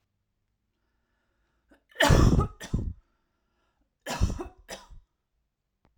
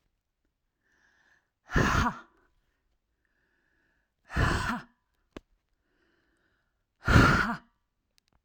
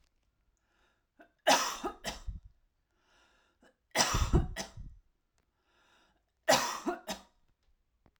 {"cough_length": "6.0 s", "cough_amplitude": 14523, "cough_signal_mean_std_ratio": 0.3, "exhalation_length": "8.4 s", "exhalation_amplitude": 15808, "exhalation_signal_mean_std_ratio": 0.3, "three_cough_length": "8.2 s", "three_cough_amplitude": 9066, "three_cough_signal_mean_std_ratio": 0.33, "survey_phase": "alpha (2021-03-01 to 2021-08-12)", "age": "18-44", "gender": "Female", "wearing_mask": "No", "symptom_none": true, "smoker_status": "Ex-smoker", "respiratory_condition_asthma": false, "respiratory_condition_other": false, "recruitment_source": "REACT", "submission_delay": "2 days", "covid_test_result": "Negative", "covid_test_method": "RT-qPCR"}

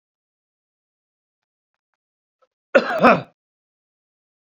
{"cough_length": "4.5 s", "cough_amplitude": 28001, "cough_signal_mean_std_ratio": 0.21, "survey_phase": "beta (2021-08-13 to 2022-03-07)", "age": "65+", "gender": "Male", "wearing_mask": "No", "symptom_cough_any": true, "smoker_status": "Current smoker (1 to 10 cigarettes per day)", "respiratory_condition_asthma": false, "respiratory_condition_other": false, "recruitment_source": "REACT", "submission_delay": "2 days", "covid_test_result": "Negative", "covid_test_method": "RT-qPCR"}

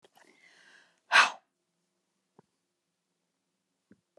{"exhalation_length": "4.2 s", "exhalation_amplitude": 14357, "exhalation_signal_mean_std_ratio": 0.16, "survey_phase": "beta (2021-08-13 to 2022-03-07)", "age": "65+", "gender": "Female", "wearing_mask": "Yes", "symptom_none": true, "smoker_status": "Never smoked", "respiratory_condition_asthma": false, "respiratory_condition_other": false, "recruitment_source": "REACT", "submission_delay": "3 days", "covid_test_result": "Negative", "covid_test_method": "RT-qPCR"}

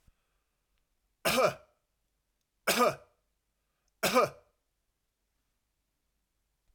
{"three_cough_length": "6.7 s", "three_cough_amplitude": 7991, "three_cough_signal_mean_std_ratio": 0.27, "survey_phase": "alpha (2021-03-01 to 2021-08-12)", "age": "65+", "gender": "Male", "wearing_mask": "No", "symptom_none": true, "smoker_status": "Never smoked", "respiratory_condition_asthma": false, "respiratory_condition_other": false, "recruitment_source": "REACT", "submission_delay": "2 days", "covid_test_result": "Negative", "covid_test_method": "RT-qPCR"}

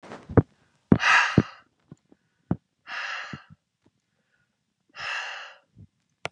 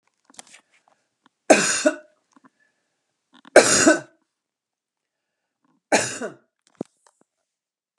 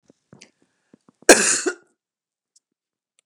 {"exhalation_length": "6.3 s", "exhalation_amplitude": 29358, "exhalation_signal_mean_std_ratio": 0.27, "three_cough_length": "8.0 s", "three_cough_amplitude": 32767, "three_cough_signal_mean_std_ratio": 0.26, "cough_length": "3.3 s", "cough_amplitude": 32768, "cough_signal_mean_std_ratio": 0.22, "survey_phase": "beta (2021-08-13 to 2022-03-07)", "age": "45-64", "gender": "Female", "wearing_mask": "No", "symptom_none": true, "smoker_status": "Never smoked", "respiratory_condition_asthma": false, "respiratory_condition_other": false, "recruitment_source": "REACT", "submission_delay": "3 days", "covid_test_result": "Negative", "covid_test_method": "RT-qPCR"}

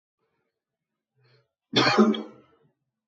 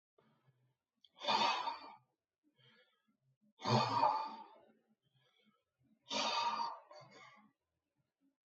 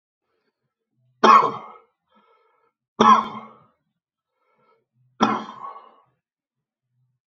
{"cough_length": "3.1 s", "cough_amplitude": 19155, "cough_signal_mean_std_ratio": 0.31, "exhalation_length": "8.4 s", "exhalation_amplitude": 3742, "exhalation_signal_mean_std_ratio": 0.39, "three_cough_length": "7.3 s", "three_cough_amplitude": 28260, "three_cough_signal_mean_std_ratio": 0.25, "survey_phase": "beta (2021-08-13 to 2022-03-07)", "age": "65+", "gender": "Male", "wearing_mask": "No", "symptom_none": true, "smoker_status": "Ex-smoker", "respiratory_condition_asthma": false, "respiratory_condition_other": false, "recruitment_source": "REACT", "submission_delay": "3 days", "covid_test_result": "Negative", "covid_test_method": "RT-qPCR"}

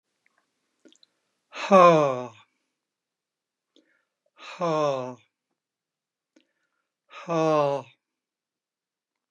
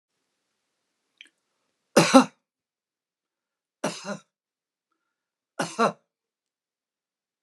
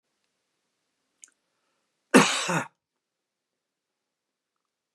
{"exhalation_length": "9.3 s", "exhalation_amplitude": 24740, "exhalation_signal_mean_std_ratio": 0.29, "three_cough_length": "7.4 s", "three_cough_amplitude": 32550, "three_cough_signal_mean_std_ratio": 0.19, "cough_length": "4.9 s", "cough_amplitude": 25631, "cough_signal_mean_std_ratio": 0.2, "survey_phase": "beta (2021-08-13 to 2022-03-07)", "age": "65+", "gender": "Male", "wearing_mask": "No", "symptom_none": true, "smoker_status": "Ex-smoker", "respiratory_condition_asthma": false, "respiratory_condition_other": false, "recruitment_source": "REACT", "submission_delay": "1 day", "covid_test_result": "Negative", "covid_test_method": "RT-qPCR", "influenza_a_test_result": "Negative", "influenza_b_test_result": "Negative"}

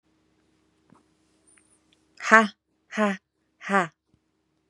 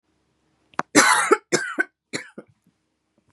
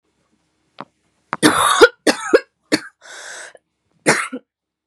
{"exhalation_length": "4.7 s", "exhalation_amplitude": 32544, "exhalation_signal_mean_std_ratio": 0.23, "cough_length": "3.3 s", "cough_amplitude": 32754, "cough_signal_mean_std_ratio": 0.33, "three_cough_length": "4.9 s", "three_cough_amplitude": 32768, "three_cough_signal_mean_std_ratio": 0.33, "survey_phase": "beta (2021-08-13 to 2022-03-07)", "age": "18-44", "gender": "Female", "wearing_mask": "No", "symptom_runny_or_blocked_nose": true, "symptom_shortness_of_breath": true, "symptom_sore_throat": true, "symptom_headache": true, "symptom_onset": "13 days", "smoker_status": "Current smoker (e-cigarettes or vapes only)", "respiratory_condition_asthma": false, "respiratory_condition_other": false, "recruitment_source": "REACT", "submission_delay": "3 days", "covid_test_result": "Negative", "covid_test_method": "RT-qPCR", "influenza_a_test_result": "Negative", "influenza_b_test_result": "Negative"}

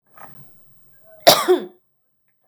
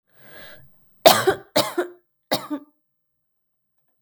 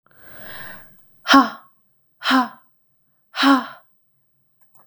{"cough_length": "2.5 s", "cough_amplitude": 32768, "cough_signal_mean_std_ratio": 0.28, "three_cough_length": "4.0 s", "three_cough_amplitude": 32768, "three_cough_signal_mean_std_ratio": 0.28, "exhalation_length": "4.9 s", "exhalation_amplitude": 32766, "exhalation_signal_mean_std_ratio": 0.31, "survey_phase": "beta (2021-08-13 to 2022-03-07)", "age": "18-44", "gender": "Female", "wearing_mask": "No", "symptom_none": true, "smoker_status": "Never smoked", "respiratory_condition_asthma": false, "respiratory_condition_other": false, "recruitment_source": "REACT", "submission_delay": "1 day", "covid_test_result": "Negative", "covid_test_method": "RT-qPCR", "influenza_a_test_result": "Negative", "influenza_b_test_result": "Negative"}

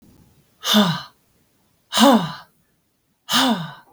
{"exhalation_length": "3.9 s", "exhalation_amplitude": 26888, "exhalation_signal_mean_std_ratio": 0.42, "survey_phase": "beta (2021-08-13 to 2022-03-07)", "age": "18-44", "gender": "Female", "wearing_mask": "No", "symptom_headache": true, "smoker_status": "Ex-smoker", "respiratory_condition_asthma": false, "respiratory_condition_other": false, "recruitment_source": "REACT", "submission_delay": "8 days", "covid_test_result": "Negative", "covid_test_method": "RT-qPCR", "influenza_a_test_result": "Negative", "influenza_b_test_result": "Negative"}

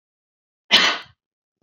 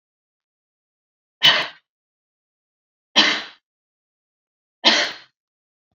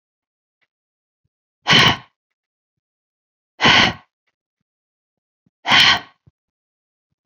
{"cough_length": "1.6 s", "cough_amplitude": 30763, "cough_signal_mean_std_ratio": 0.3, "three_cough_length": "6.0 s", "three_cough_amplitude": 30248, "three_cough_signal_mean_std_ratio": 0.26, "exhalation_length": "7.3 s", "exhalation_amplitude": 31695, "exhalation_signal_mean_std_ratio": 0.28, "survey_phase": "beta (2021-08-13 to 2022-03-07)", "age": "18-44", "gender": "Female", "wearing_mask": "No", "symptom_none": true, "smoker_status": "Never smoked", "respiratory_condition_asthma": false, "respiratory_condition_other": false, "recruitment_source": "REACT", "submission_delay": "2 days", "covid_test_result": "Negative", "covid_test_method": "RT-qPCR"}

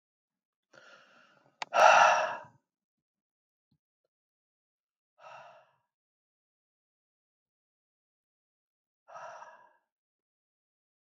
{"exhalation_length": "11.2 s", "exhalation_amplitude": 13779, "exhalation_signal_mean_std_ratio": 0.19, "survey_phase": "alpha (2021-03-01 to 2021-08-12)", "age": "45-64", "gender": "Male", "wearing_mask": "No", "symptom_none": true, "smoker_status": "Never smoked", "respiratory_condition_asthma": false, "respiratory_condition_other": false, "recruitment_source": "REACT", "submission_delay": "1 day", "covid_test_result": "Negative", "covid_test_method": "RT-qPCR"}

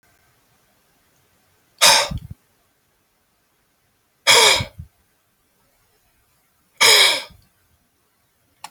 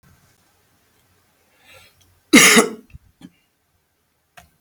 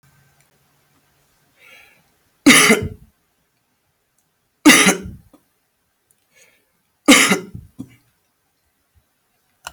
{"exhalation_length": "8.7 s", "exhalation_amplitude": 32768, "exhalation_signal_mean_std_ratio": 0.28, "cough_length": "4.6 s", "cough_amplitude": 32767, "cough_signal_mean_std_ratio": 0.23, "three_cough_length": "9.7 s", "three_cough_amplitude": 32768, "three_cough_signal_mean_std_ratio": 0.26, "survey_phase": "beta (2021-08-13 to 2022-03-07)", "age": "65+", "gender": "Male", "wearing_mask": "No", "symptom_cough_any": true, "symptom_headache": true, "smoker_status": "Ex-smoker", "respiratory_condition_asthma": false, "respiratory_condition_other": true, "recruitment_source": "REACT", "submission_delay": "2 days", "covid_test_result": "Negative", "covid_test_method": "RT-qPCR"}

